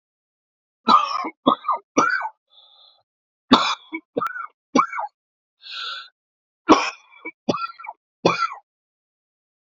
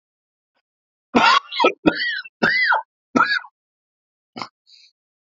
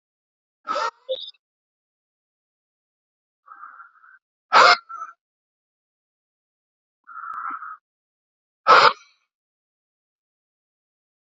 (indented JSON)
{
  "three_cough_length": "9.6 s",
  "three_cough_amplitude": 32767,
  "three_cough_signal_mean_std_ratio": 0.35,
  "cough_length": "5.3 s",
  "cough_amplitude": 32767,
  "cough_signal_mean_std_ratio": 0.41,
  "exhalation_length": "11.3 s",
  "exhalation_amplitude": 32637,
  "exhalation_signal_mean_std_ratio": 0.21,
  "survey_phase": "beta (2021-08-13 to 2022-03-07)",
  "age": "45-64",
  "gender": "Male",
  "wearing_mask": "No",
  "symptom_shortness_of_breath": true,
  "symptom_fatigue": true,
  "symptom_onset": "12 days",
  "smoker_status": "Ex-smoker",
  "respiratory_condition_asthma": false,
  "respiratory_condition_other": true,
  "recruitment_source": "REACT",
  "submission_delay": "20 days",
  "covid_test_result": "Negative",
  "covid_test_method": "RT-qPCR"
}